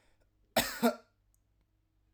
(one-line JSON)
{"cough_length": "2.1 s", "cough_amplitude": 7010, "cough_signal_mean_std_ratio": 0.28, "survey_phase": "alpha (2021-03-01 to 2021-08-12)", "age": "18-44", "gender": "Male", "wearing_mask": "No", "symptom_headache": true, "symptom_onset": "4 days", "smoker_status": "Never smoked", "respiratory_condition_asthma": false, "respiratory_condition_other": false, "recruitment_source": "REACT", "submission_delay": "2 days", "covid_test_result": "Negative", "covid_test_method": "RT-qPCR"}